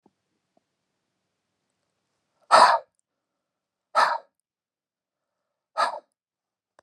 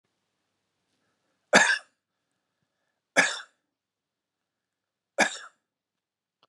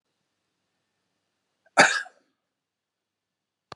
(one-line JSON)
{"exhalation_length": "6.8 s", "exhalation_amplitude": 26762, "exhalation_signal_mean_std_ratio": 0.22, "three_cough_length": "6.5 s", "three_cough_amplitude": 26597, "three_cough_signal_mean_std_ratio": 0.21, "cough_length": "3.8 s", "cough_amplitude": 27253, "cough_signal_mean_std_ratio": 0.17, "survey_phase": "alpha (2021-03-01 to 2021-08-12)", "age": "65+", "gender": "Male", "wearing_mask": "No", "symptom_none": true, "smoker_status": "Ex-smoker", "respiratory_condition_asthma": true, "respiratory_condition_other": true, "recruitment_source": "REACT", "submission_delay": "2 days", "covid_test_result": "Negative", "covid_test_method": "RT-qPCR"}